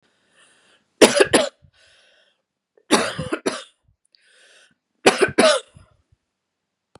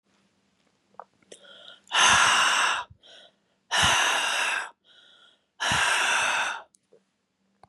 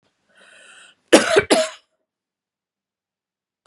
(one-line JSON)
{"three_cough_length": "7.0 s", "three_cough_amplitude": 32768, "three_cough_signal_mean_std_ratio": 0.3, "exhalation_length": "7.7 s", "exhalation_amplitude": 15568, "exhalation_signal_mean_std_ratio": 0.53, "cough_length": "3.7 s", "cough_amplitude": 32768, "cough_signal_mean_std_ratio": 0.26, "survey_phase": "beta (2021-08-13 to 2022-03-07)", "age": "45-64", "gender": "Female", "wearing_mask": "No", "symptom_cough_any": true, "symptom_runny_or_blocked_nose": true, "symptom_sore_throat": true, "symptom_headache": true, "symptom_onset": "4 days", "smoker_status": "Never smoked", "respiratory_condition_asthma": false, "respiratory_condition_other": false, "recruitment_source": "Test and Trace", "submission_delay": "2 days", "covid_test_result": "Positive", "covid_test_method": "ePCR"}